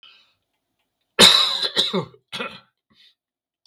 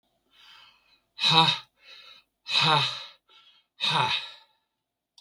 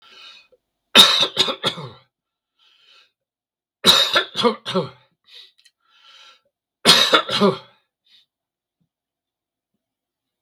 {
  "cough_length": "3.7 s",
  "cough_amplitude": 32768,
  "cough_signal_mean_std_ratio": 0.33,
  "exhalation_length": "5.2 s",
  "exhalation_amplitude": 21556,
  "exhalation_signal_mean_std_ratio": 0.4,
  "three_cough_length": "10.4 s",
  "three_cough_amplitude": 32768,
  "three_cough_signal_mean_std_ratio": 0.32,
  "survey_phase": "beta (2021-08-13 to 2022-03-07)",
  "age": "65+",
  "gender": "Male",
  "wearing_mask": "No",
  "symptom_none": true,
  "smoker_status": "Ex-smoker",
  "respiratory_condition_asthma": false,
  "respiratory_condition_other": false,
  "recruitment_source": "REACT",
  "submission_delay": "2 days",
  "covid_test_result": "Negative",
  "covid_test_method": "RT-qPCR",
  "influenza_a_test_result": "Negative",
  "influenza_b_test_result": "Negative"
}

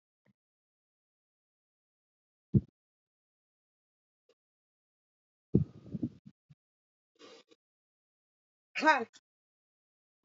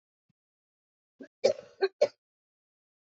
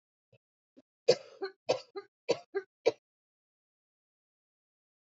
{
  "exhalation_length": "10.2 s",
  "exhalation_amplitude": 10245,
  "exhalation_signal_mean_std_ratio": 0.16,
  "cough_length": "3.2 s",
  "cough_amplitude": 9836,
  "cough_signal_mean_std_ratio": 0.21,
  "three_cough_length": "5.0 s",
  "three_cough_amplitude": 9348,
  "three_cough_signal_mean_std_ratio": 0.21,
  "survey_phase": "beta (2021-08-13 to 2022-03-07)",
  "age": "45-64",
  "gender": "Female",
  "wearing_mask": "No",
  "symptom_cough_any": true,
  "symptom_sore_throat": true,
  "symptom_headache": true,
  "symptom_change_to_sense_of_smell_or_taste": true,
  "symptom_loss_of_taste": true,
  "symptom_onset": "2 days",
  "smoker_status": "Ex-smoker",
  "respiratory_condition_asthma": false,
  "respiratory_condition_other": false,
  "recruitment_source": "Test and Trace",
  "submission_delay": "1 day",
  "covid_test_result": "Positive",
  "covid_test_method": "RT-qPCR",
  "covid_ct_value": 15.2,
  "covid_ct_gene": "ORF1ab gene",
  "covid_ct_mean": 15.7,
  "covid_viral_load": "7300000 copies/ml",
  "covid_viral_load_category": "High viral load (>1M copies/ml)"
}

